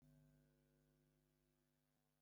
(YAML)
cough_length: 2.2 s
cough_amplitude: 24
cough_signal_mean_std_ratio: 0.79
survey_phase: beta (2021-08-13 to 2022-03-07)
age: 65+
gender: Male
wearing_mask: 'No'
symptom_none: true
smoker_status: Ex-smoker
respiratory_condition_asthma: false
respiratory_condition_other: false
recruitment_source: REACT
submission_delay: 2 days
covid_test_result: Negative
covid_test_method: RT-qPCR
influenza_a_test_result: Negative
influenza_b_test_result: Negative